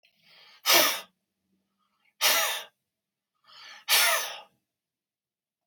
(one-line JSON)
{"exhalation_length": "5.7 s", "exhalation_amplitude": 14880, "exhalation_signal_mean_std_ratio": 0.36, "survey_phase": "beta (2021-08-13 to 2022-03-07)", "age": "65+", "gender": "Male", "wearing_mask": "No", "symptom_cough_any": true, "smoker_status": "Never smoked", "respiratory_condition_asthma": false, "respiratory_condition_other": false, "recruitment_source": "REACT", "submission_delay": "11 days", "covid_test_result": "Negative", "covid_test_method": "RT-qPCR", "influenza_a_test_result": "Negative", "influenza_b_test_result": "Negative"}